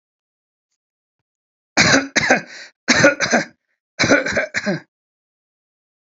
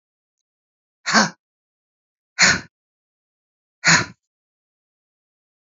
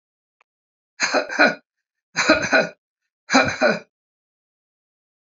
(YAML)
cough_length: 6.1 s
cough_amplitude: 32767
cough_signal_mean_std_ratio: 0.4
exhalation_length: 5.6 s
exhalation_amplitude: 32351
exhalation_signal_mean_std_ratio: 0.25
three_cough_length: 5.2 s
three_cough_amplitude: 31239
three_cough_signal_mean_std_ratio: 0.38
survey_phase: beta (2021-08-13 to 2022-03-07)
age: 45-64
gender: Female
wearing_mask: 'No'
symptom_headache: true
smoker_status: Never smoked
respiratory_condition_asthma: false
respiratory_condition_other: false
recruitment_source: REACT
submission_delay: 4 days
covid_test_result: Negative
covid_test_method: RT-qPCR
influenza_a_test_result: Negative
influenza_b_test_result: Negative